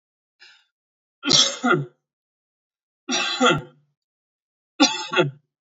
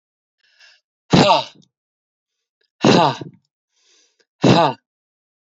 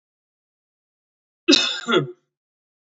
three_cough_length: 5.7 s
three_cough_amplitude: 29138
three_cough_signal_mean_std_ratio: 0.37
exhalation_length: 5.5 s
exhalation_amplitude: 29163
exhalation_signal_mean_std_ratio: 0.33
cough_length: 2.9 s
cough_amplitude: 30617
cough_signal_mean_std_ratio: 0.3
survey_phase: beta (2021-08-13 to 2022-03-07)
age: 18-44
gender: Male
wearing_mask: 'No'
symptom_none: true
smoker_status: Never smoked
respiratory_condition_asthma: false
respiratory_condition_other: false
recruitment_source: Test and Trace
submission_delay: 2 days
covid_test_result: Negative
covid_test_method: ePCR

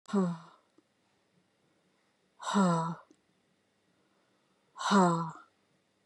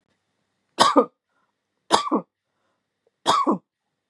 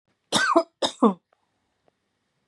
exhalation_length: 6.1 s
exhalation_amplitude: 7294
exhalation_signal_mean_std_ratio: 0.34
three_cough_length: 4.1 s
three_cough_amplitude: 32703
three_cough_signal_mean_std_ratio: 0.32
cough_length: 2.5 s
cough_amplitude: 20798
cough_signal_mean_std_ratio: 0.34
survey_phase: beta (2021-08-13 to 2022-03-07)
age: 45-64
gender: Female
wearing_mask: 'No'
symptom_runny_or_blocked_nose: true
symptom_sore_throat: true
symptom_headache: true
smoker_status: Never smoked
respiratory_condition_asthma: false
respiratory_condition_other: false
recruitment_source: Test and Trace
submission_delay: 2 days
covid_test_result: Positive
covid_test_method: RT-qPCR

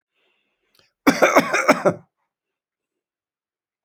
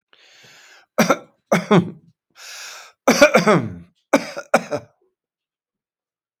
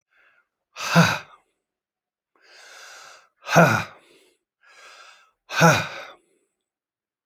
cough_length: 3.8 s
cough_amplitude: 29049
cough_signal_mean_std_ratio: 0.31
three_cough_length: 6.4 s
three_cough_amplitude: 30140
three_cough_signal_mean_std_ratio: 0.35
exhalation_length: 7.3 s
exhalation_amplitude: 28324
exhalation_signal_mean_std_ratio: 0.29
survey_phase: alpha (2021-03-01 to 2021-08-12)
age: 65+
gender: Male
wearing_mask: 'No'
symptom_none: true
smoker_status: Never smoked
respiratory_condition_asthma: true
respiratory_condition_other: false
recruitment_source: REACT
submission_delay: 2 days
covid_test_result: Negative
covid_test_method: RT-qPCR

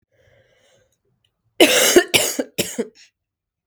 cough_length: 3.7 s
cough_amplitude: 32768
cough_signal_mean_std_ratio: 0.35
survey_phase: beta (2021-08-13 to 2022-03-07)
age: 18-44
gender: Female
wearing_mask: 'No'
symptom_cough_any: true
symptom_runny_or_blocked_nose: true
symptom_fatigue: true
symptom_headache: true
symptom_change_to_sense_of_smell_or_taste: true
symptom_loss_of_taste: true
symptom_other: true
symptom_onset: 3 days
smoker_status: Never smoked
respiratory_condition_asthma: false
respiratory_condition_other: false
recruitment_source: REACT
submission_delay: 1 day
covid_test_result: Negative
covid_test_method: RT-qPCR
influenza_a_test_result: Negative
influenza_b_test_result: Negative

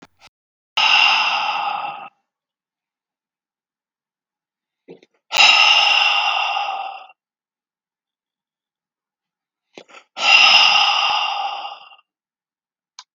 exhalation_length: 13.1 s
exhalation_amplitude: 32768
exhalation_signal_mean_std_ratio: 0.44
survey_phase: beta (2021-08-13 to 2022-03-07)
age: 65+
gender: Male
wearing_mask: 'No'
symptom_none: true
smoker_status: Never smoked
respiratory_condition_asthma: false
respiratory_condition_other: false
recruitment_source: REACT
submission_delay: 1 day
covid_test_result: Negative
covid_test_method: RT-qPCR
influenza_a_test_result: Negative
influenza_b_test_result: Negative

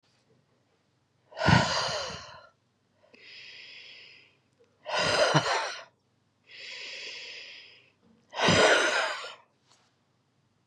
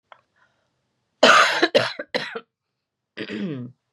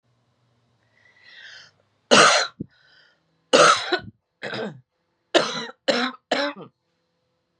exhalation_length: 10.7 s
exhalation_amplitude: 16221
exhalation_signal_mean_std_ratio: 0.41
cough_length: 3.9 s
cough_amplitude: 28623
cough_signal_mean_std_ratio: 0.37
three_cough_length: 7.6 s
three_cough_amplitude: 29838
three_cough_signal_mean_std_ratio: 0.34
survey_phase: beta (2021-08-13 to 2022-03-07)
age: 45-64
gender: Female
wearing_mask: 'No'
symptom_cough_any: true
symptom_runny_or_blocked_nose: true
symptom_sore_throat: true
symptom_headache: true
symptom_onset: 5 days
smoker_status: Ex-smoker
respiratory_condition_asthma: false
respiratory_condition_other: false
recruitment_source: Test and Trace
submission_delay: 1 day
covid_test_result: Positive
covid_test_method: RT-qPCR
covid_ct_value: 28.0
covid_ct_gene: N gene
covid_ct_mean: 28.1
covid_viral_load: 610 copies/ml
covid_viral_load_category: Minimal viral load (< 10K copies/ml)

